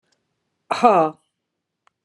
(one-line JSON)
{"exhalation_length": "2.0 s", "exhalation_amplitude": 32342, "exhalation_signal_mean_std_ratio": 0.31, "survey_phase": "beta (2021-08-13 to 2022-03-07)", "age": "65+", "gender": "Female", "wearing_mask": "No", "symptom_none": true, "smoker_status": "Never smoked", "respiratory_condition_asthma": false, "respiratory_condition_other": false, "recruitment_source": "REACT", "submission_delay": "30 days", "covid_test_result": "Negative", "covid_test_method": "RT-qPCR"}